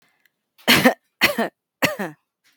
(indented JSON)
{
  "three_cough_length": "2.6 s",
  "three_cough_amplitude": 32768,
  "three_cough_signal_mean_std_ratio": 0.37,
  "survey_phase": "beta (2021-08-13 to 2022-03-07)",
  "age": "18-44",
  "gender": "Female",
  "wearing_mask": "No",
  "symptom_none": true,
  "smoker_status": "Current smoker (1 to 10 cigarettes per day)",
  "respiratory_condition_asthma": false,
  "respiratory_condition_other": false,
  "recruitment_source": "REACT",
  "submission_delay": "3 days",
  "covid_test_result": "Negative",
  "covid_test_method": "RT-qPCR"
}